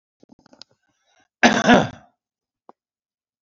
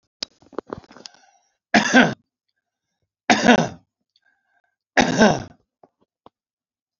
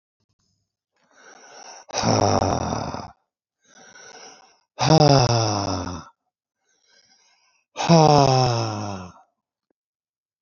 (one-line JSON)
{"cough_length": "3.4 s", "cough_amplitude": 28029, "cough_signal_mean_std_ratio": 0.26, "three_cough_length": "7.0 s", "three_cough_amplitude": 32768, "three_cough_signal_mean_std_ratio": 0.29, "exhalation_length": "10.4 s", "exhalation_amplitude": 29421, "exhalation_signal_mean_std_ratio": 0.4, "survey_phase": "beta (2021-08-13 to 2022-03-07)", "age": "65+", "gender": "Male", "wearing_mask": "No", "symptom_none": true, "smoker_status": "Ex-smoker", "respiratory_condition_asthma": false, "respiratory_condition_other": true, "recruitment_source": "REACT", "submission_delay": "3 days", "covid_test_result": "Negative", "covid_test_method": "RT-qPCR", "influenza_a_test_result": "Unknown/Void", "influenza_b_test_result": "Unknown/Void"}